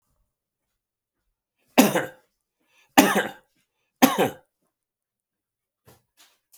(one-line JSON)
{"three_cough_length": "6.6 s", "three_cough_amplitude": 32767, "three_cough_signal_mean_std_ratio": 0.24, "survey_phase": "beta (2021-08-13 to 2022-03-07)", "age": "65+", "gender": "Male", "wearing_mask": "No", "symptom_cough_any": true, "symptom_runny_or_blocked_nose": true, "symptom_sore_throat": true, "smoker_status": "Ex-smoker", "respiratory_condition_asthma": false, "respiratory_condition_other": false, "recruitment_source": "Test and Trace", "submission_delay": "2 days", "covid_test_result": "Positive", "covid_test_method": "ePCR"}